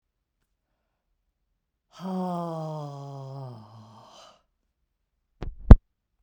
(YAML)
exhalation_length: 6.2 s
exhalation_amplitude: 32768
exhalation_signal_mean_std_ratio: 0.16
survey_phase: beta (2021-08-13 to 2022-03-07)
age: 45-64
gender: Female
wearing_mask: 'No'
symptom_none: true
smoker_status: Never smoked
respiratory_condition_asthma: false
respiratory_condition_other: false
recruitment_source: REACT
submission_delay: 1 day
covid_test_result: Negative
covid_test_method: RT-qPCR
influenza_a_test_result: Negative
influenza_b_test_result: Negative